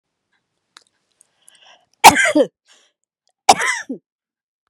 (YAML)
cough_length: 4.7 s
cough_amplitude: 32768
cough_signal_mean_std_ratio: 0.25
survey_phase: beta (2021-08-13 to 2022-03-07)
age: 65+
gender: Female
wearing_mask: 'No'
symptom_none: true
smoker_status: Never smoked
respiratory_condition_asthma: false
respiratory_condition_other: false
recruitment_source: REACT
submission_delay: 6 days
covid_test_result: Negative
covid_test_method: RT-qPCR
influenza_a_test_result: Negative
influenza_b_test_result: Negative